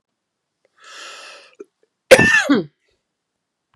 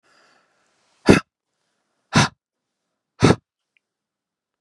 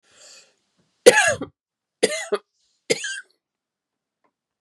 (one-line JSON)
{"cough_length": "3.8 s", "cough_amplitude": 32768, "cough_signal_mean_std_ratio": 0.28, "exhalation_length": "4.6 s", "exhalation_amplitude": 32768, "exhalation_signal_mean_std_ratio": 0.21, "three_cough_length": "4.6 s", "three_cough_amplitude": 32768, "three_cough_signal_mean_std_ratio": 0.25, "survey_phase": "beta (2021-08-13 to 2022-03-07)", "age": "45-64", "gender": "Female", "wearing_mask": "No", "symptom_runny_or_blocked_nose": true, "smoker_status": "Ex-smoker", "respiratory_condition_asthma": true, "respiratory_condition_other": false, "recruitment_source": "REACT", "submission_delay": "2 days", "covid_test_result": "Negative", "covid_test_method": "RT-qPCR", "influenza_a_test_result": "Negative", "influenza_b_test_result": "Negative"}